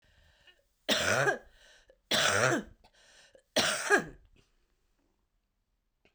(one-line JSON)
{"three_cough_length": "6.1 s", "three_cough_amplitude": 8144, "three_cough_signal_mean_std_ratio": 0.4, "survey_phase": "beta (2021-08-13 to 2022-03-07)", "age": "45-64", "gender": "Female", "wearing_mask": "No", "symptom_new_continuous_cough": true, "symptom_runny_or_blocked_nose": true, "symptom_sore_throat": true, "symptom_fatigue": true, "symptom_fever_high_temperature": true, "symptom_headache": true, "symptom_onset": "1 day", "smoker_status": "Never smoked", "respiratory_condition_asthma": false, "respiratory_condition_other": false, "recruitment_source": "Test and Trace", "submission_delay": "1 day", "covid_test_result": "Negative", "covid_test_method": "RT-qPCR"}